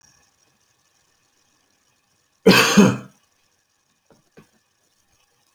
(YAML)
cough_length: 5.5 s
cough_amplitude: 29786
cough_signal_mean_std_ratio: 0.23
survey_phase: alpha (2021-03-01 to 2021-08-12)
age: 45-64
gender: Male
wearing_mask: 'No'
symptom_none: true
smoker_status: Never smoked
respiratory_condition_asthma: false
respiratory_condition_other: false
recruitment_source: REACT
submission_delay: 2 days
covid_test_result: Negative
covid_test_method: RT-qPCR